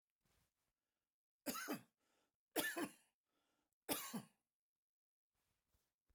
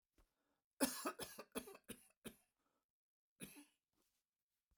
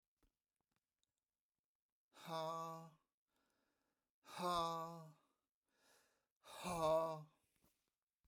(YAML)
three_cough_length: 6.1 s
three_cough_amplitude: 1840
three_cough_signal_mean_std_ratio: 0.3
cough_length: 4.8 s
cough_amplitude: 2421
cough_signal_mean_std_ratio: 0.27
exhalation_length: 8.3 s
exhalation_amplitude: 1299
exhalation_signal_mean_std_ratio: 0.36
survey_phase: beta (2021-08-13 to 2022-03-07)
age: 65+
gender: Male
wearing_mask: 'No'
symptom_none: true
smoker_status: Ex-smoker
respiratory_condition_asthma: false
respiratory_condition_other: false
recruitment_source: REACT
submission_delay: 1 day
covid_test_result: Negative
covid_test_method: RT-qPCR